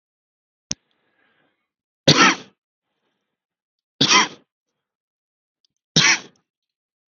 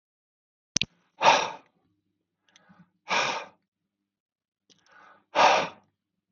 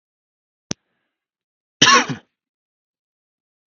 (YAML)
three_cough_length: 7.1 s
three_cough_amplitude: 32768
three_cough_signal_mean_std_ratio: 0.25
exhalation_length: 6.3 s
exhalation_amplitude: 29388
exhalation_signal_mean_std_ratio: 0.28
cough_length: 3.8 s
cough_amplitude: 32768
cough_signal_mean_std_ratio: 0.21
survey_phase: beta (2021-08-13 to 2022-03-07)
age: 18-44
gender: Male
wearing_mask: 'No'
symptom_none: true
smoker_status: Never smoked
respiratory_condition_asthma: false
respiratory_condition_other: false
recruitment_source: REACT
submission_delay: 1 day
covid_test_result: Negative
covid_test_method: RT-qPCR
influenza_a_test_result: Unknown/Void
influenza_b_test_result: Unknown/Void